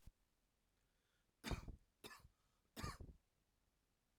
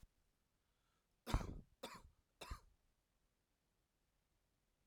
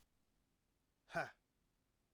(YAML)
three_cough_length: 4.2 s
three_cough_amplitude: 737
three_cough_signal_mean_std_ratio: 0.32
cough_length: 4.9 s
cough_amplitude: 2112
cough_signal_mean_std_ratio: 0.23
exhalation_length: 2.1 s
exhalation_amplitude: 1030
exhalation_signal_mean_std_ratio: 0.22
survey_phase: beta (2021-08-13 to 2022-03-07)
age: 45-64
gender: Male
wearing_mask: 'No'
symptom_runny_or_blocked_nose: true
symptom_sore_throat: true
symptom_fatigue: true
symptom_change_to_sense_of_smell_or_taste: true
symptom_loss_of_taste: true
symptom_onset: 4 days
smoker_status: Ex-smoker
respiratory_condition_asthma: false
respiratory_condition_other: false
recruitment_source: Test and Trace
submission_delay: 1 day
covid_test_result: Positive
covid_test_method: RT-qPCR
covid_ct_value: 19.5
covid_ct_gene: N gene